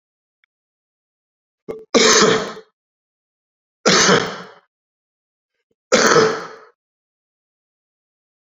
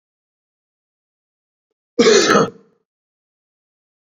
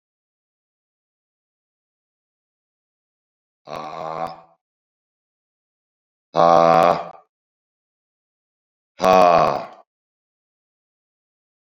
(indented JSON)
{
  "three_cough_length": "8.4 s",
  "three_cough_amplitude": 32368,
  "three_cough_signal_mean_std_ratio": 0.34,
  "cough_length": "4.2 s",
  "cough_amplitude": 31850,
  "cough_signal_mean_std_ratio": 0.27,
  "exhalation_length": "11.8 s",
  "exhalation_amplitude": 30285,
  "exhalation_signal_mean_std_ratio": 0.25,
  "survey_phase": "beta (2021-08-13 to 2022-03-07)",
  "age": "45-64",
  "gender": "Male",
  "wearing_mask": "No",
  "symptom_cough_any": true,
  "symptom_runny_or_blocked_nose": true,
  "symptom_headache": true,
  "symptom_change_to_sense_of_smell_or_taste": true,
  "symptom_loss_of_taste": true,
  "symptom_onset": "3 days",
  "smoker_status": "Ex-smoker",
  "respiratory_condition_asthma": false,
  "respiratory_condition_other": false,
  "recruitment_source": "Test and Trace",
  "submission_delay": "2 days",
  "covid_test_result": "Positive",
  "covid_test_method": "RT-qPCR",
  "covid_ct_value": 15.1,
  "covid_ct_gene": "ORF1ab gene",
  "covid_ct_mean": 15.5,
  "covid_viral_load": "8300000 copies/ml",
  "covid_viral_load_category": "High viral load (>1M copies/ml)"
}